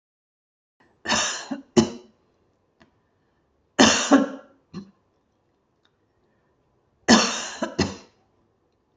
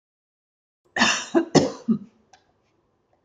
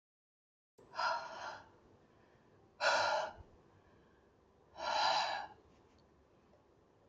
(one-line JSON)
{"three_cough_length": "9.0 s", "three_cough_amplitude": 29008, "three_cough_signal_mean_std_ratio": 0.3, "cough_length": "3.2 s", "cough_amplitude": 26367, "cough_signal_mean_std_ratio": 0.34, "exhalation_length": "7.1 s", "exhalation_amplitude": 3266, "exhalation_signal_mean_std_ratio": 0.42, "survey_phase": "beta (2021-08-13 to 2022-03-07)", "age": "45-64", "gender": "Female", "wearing_mask": "No", "symptom_cough_any": true, "symptom_runny_or_blocked_nose": true, "symptom_onset": "13 days", "smoker_status": "Never smoked", "respiratory_condition_asthma": false, "respiratory_condition_other": false, "recruitment_source": "REACT", "submission_delay": "1 day", "covid_test_result": "Negative", "covid_test_method": "RT-qPCR", "influenza_a_test_result": "Negative", "influenza_b_test_result": "Negative"}